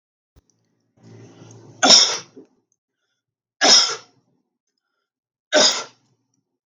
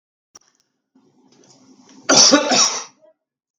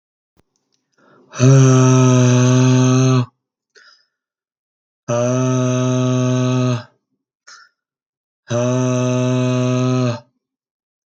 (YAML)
three_cough_length: 6.7 s
three_cough_amplitude: 32768
three_cough_signal_mean_std_ratio: 0.3
cough_length: 3.6 s
cough_amplitude: 32768
cough_signal_mean_std_ratio: 0.35
exhalation_length: 11.1 s
exhalation_amplitude: 32768
exhalation_signal_mean_std_ratio: 0.64
survey_phase: beta (2021-08-13 to 2022-03-07)
age: 45-64
gender: Male
wearing_mask: 'No'
symptom_none: true
symptom_onset: 12 days
smoker_status: Never smoked
respiratory_condition_asthma: false
respiratory_condition_other: false
recruitment_source: REACT
submission_delay: 2 days
covid_test_result: Negative
covid_test_method: RT-qPCR
influenza_a_test_result: Negative
influenza_b_test_result: Negative